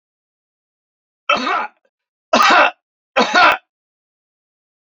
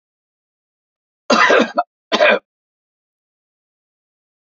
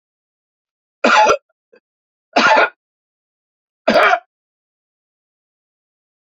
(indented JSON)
{
  "exhalation_length": "4.9 s",
  "exhalation_amplitude": 32767,
  "exhalation_signal_mean_std_ratio": 0.37,
  "cough_length": "4.4 s",
  "cough_amplitude": 30921,
  "cough_signal_mean_std_ratio": 0.31,
  "three_cough_length": "6.2 s",
  "three_cough_amplitude": 32768,
  "three_cough_signal_mean_std_ratio": 0.32,
  "survey_phase": "beta (2021-08-13 to 2022-03-07)",
  "age": "45-64",
  "gender": "Male",
  "wearing_mask": "No",
  "symptom_none": true,
  "smoker_status": "Ex-smoker",
  "respiratory_condition_asthma": false,
  "respiratory_condition_other": false,
  "recruitment_source": "REACT",
  "submission_delay": "1 day",
  "covid_test_result": "Negative",
  "covid_test_method": "RT-qPCR"
}